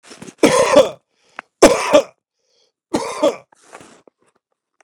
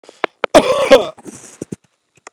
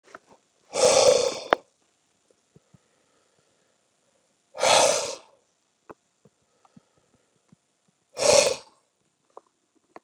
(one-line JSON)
{"three_cough_length": "4.8 s", "three_cough_amplitude": 32768, "three_cough_signal_mean_std_ratio": 0.35, "cough_length": "2.3 s", "cough_amplitude": 32768, "cough_signal_mean_std_ratio": 0.35, "exhalation_length": "10.0 s", "exhalation_amplitude": 32767, "exhalation_signal_mean_std_ratio": 0.29, "survey_phase": "beta (2021-08-13 to 2022-03-07)", "age": "45-64", "gender": "Male", "wearing_mask": "No", "symptom_none": true, "smoker_status": "Never smoked", "respiratory_condition_asthma": false, "respiratory_condition_other": false, "recruitment_source": "REACT", "submission_delay": "0 days", "covid_test_result": "Negative", "covid_test_method": "RT-qPCR", "influenza_a_test_result": "Negative", "influenza_b_test_result": "Negative"}